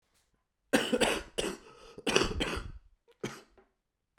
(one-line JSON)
{"three_cough_length": "4.2 s", "three_cough_amplitude": 15365, "three_cough_signal_mean_std_ratio": 0.43, "survey_phase": "beta (2021-08-13 to 2022-03-07)", "age": "18-44", "gender": "Male", "wearing_mask": "No", "symptom_cough_any": true, "symptom_runny_or_blocked_nose": true, "symptom_sore_throat": true, "symptom_abdominal_pain": true, "symptom_fever_high_temperature": true, "symptom_headache": true, "symptom_other": true, "symptom_onset": "2 days", "smoker_status": "Ex-smoker", "respiratory_condition_asthma": false, "respiratory_condition_other": false, "recruitment_source": "Test and Trace", "submission_delay": "1 day", "covid_test_result": "Positive", "covid_test_method": "ePCR"}